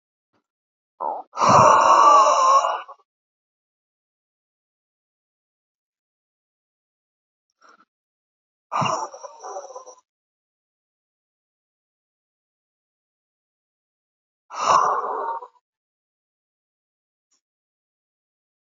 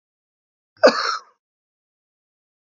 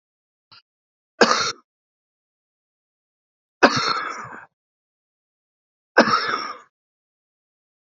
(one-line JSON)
{"exhalation_length": "18.7 s", "exhalation_amplitude": 32767, "exhalation_signal_mean_std_ratio": 0.29, "cough_length": "2.6 s", "cough_amplitude": 29336, "cough_signal_mean_std_ratio": 0.22, "three_cough_length": "7.9 s", "three_cough_amplitude": 29024, "three_cough_signal_mean_std_ratio": 0.28, "survey_phase": "beta (2021-08-13 to 2022-03-07)", "age": "65+", "gender": "Male", "wearing_mask": "No", "symptom_shortness_of_breath": true, "symptom_fatigue": true, "smoker_status": "Current smoker (e-cigarettes or vapes only)", "respiratory_condition_asthma": false, "respiratory_condition_other": true, "recruitment_source": "REACT", "submission_delay": "1 day", "covid_test_result": "Negative", "covid_test_method": "RT-qPCR", "influenza_a_test_result": "Negative", "influenza_b_test_result": "Negative"}